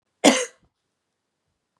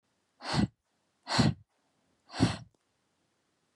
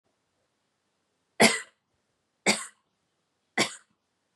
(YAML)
cough_length: 1.8 s
cough_amplitude: 32767
cough_signal_mean_std_ratio: 0.24
exhalation_length: 3.8 s
exhalation_amplitude: 8412
exhalation_signal_mean_std_ratio: 0.32
three_cough_length: 4.4 s
three_cough_amplitude: 20277
three_cough_signal_mean_std_ratio: 0.22
survey_phase: beta (2021-08-13 to 2022-03-07)
age: 18-44
gender: Female
wearing_mask: 'No'
symptom_runny_or_blocked_nose: true
smoker_status: Never smoked
respiratory_condition_asthma: false
respiratory_condition_other: false
recruitment_source: Test and Trace
submission_delay: 2 days
covid_test_result: Positive
covid_test_method: LAMP